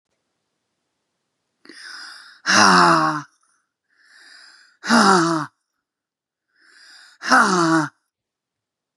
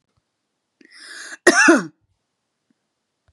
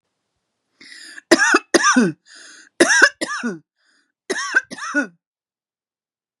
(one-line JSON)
{"exhalation_length": "9.0 s", "exhalation_amplitude": 31434, "exhalation_signal_mean_std_ratio": 0.38, "cough_length": "3.3 s", "cough_amplitude": 32768, "cough_signal_mean_std_ratio": 0.27, "three_cough_length": "6.4 s", "three_cough_amplitude": 32768, "three_cough_signal_mean_std_ratio": 0.38, "survey_phase": "beta (2021-08-13 to 2022-03-07)", "age": "65+", "gender": "Female", "wearing_mask": "No", "symptom_cough_any": true, "symptom_shortness_of_breath": true, "symptom_onset": "13 days", "smoker_status": "Ex-smoker", "respiratory_condition_asthma": true, "respiratory_condition_other": false, "recruitment_source": "REACT", "submission_delay": "1 day", "covid_test_result": "Negative", "covid_test_method": "RT-qPCR", "influenza_a_test_result": "Negative", "influenza_b_test_result": "Negative"}